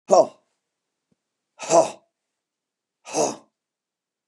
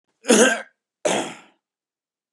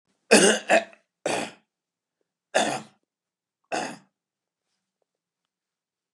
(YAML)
exhalation_length: 4.3 s
exhalation_amplitude: 27061
exhalation_signal_mean_std_ratio: 0.26
cough_length: 2.3 s
cough_amplitude: 30454
cough_signal_mean_std_ratio: 0.36
three_cough_length: 6.1 s
three_cough_amplitude: 24941
three_cough_signal_mean_std_ratio: 0.28
survey_phase: beta (2021-08-13 to 2022-03-07)
age: 45-64
gender: Male
wearing_mask: 'No'
symptom_new_continuous_cough: true
smoker_status: Never smoked
respiratory_condition_asthma: false
respiratory_condition_other: false
recruitment_source: REACT
submission_delay: 1 day
covid_test_result: Negative
covid_test_method: RT-qPCR
influenza_a_test_result: Negative
influenza_b_test_result: Negative